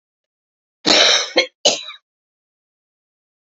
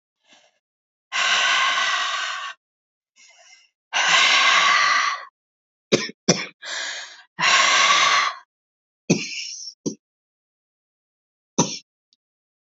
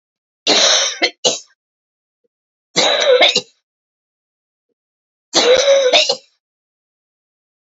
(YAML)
cough_length: 3.5 s
cough_amplitude: 32234
cough_signal_mean_std_ratio: 0.34
exhalation_length: 12.8 s
exhalation_amplitude: 31286
exhalation_signal_mean_std_ratio: 0.5
three_cough_length: 7.8 s
three_cough_amplitude: 32768
three_cough_signal_mean_std_ratio: 0.43
survey_phase: beta (2021-08-13 to 2022-03-07)
age: 45-64
gender: Female
wearing_mask: 'No'
symptom_cough_any: true
symptom_runny_or_blocked_nose: true
symptom_shortness_of_breath: true
symptom_sore_throat: true
symptom_fatigue: true
symptom_fever_high_temperature: true
symptom_headache: true
symptom_change_to_sense_of_smell_or_taste: true
symptom_other: true
symptom_onset: 3 days
smoker_status: Never smoked
respiratory_condition_asthma: true
respiratory_condition_other: false
recruitment_source: Test and Trace
submission_delay: 2 days
covid_test_result: Positive
covid_test_method: RT-qPCR
covid_ct_value: 20.4
covid_ct_gene: ORF1ab gene
covid_ct_mean: 20.7
covid_viral_load: 160000 copies/ml
covid_viral_load_category: Low viral load (10K-1M copies/ml)